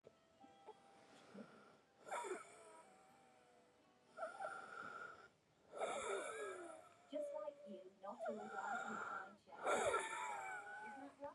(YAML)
exhalation_length: 11.3 s
exhalation_amplitude: 1395
exhalation_signal_mean_std_ratio: 0.66
survey_phase: beta (2021-08-13 to 2022-03-07)
age: 18-44
gender: Female
wearing_mask: 'No'
symptom_cough_any: true
symptom_runny_or_blocked_nose: true
symptom_shortness_of_breath: true
symptom_sore_throat: true
symptom_diarrhoea: true
symptom_fatigue: true
symptom_fever_high_temperature: true
symptom_headache: true
symptom_onset: 2 days
smoker_status: Current smoker (e-cigarettes or vapes only)
respiratory_condition_asthma: true
respiratory_condition_other: true
recruitment_source: Test and Trace
submission_delay: 2 days
covid_test_result: Positive
covid_test_method: RT-qPCR
covid_ct_value: 20.1
covid_ct_gene: N gene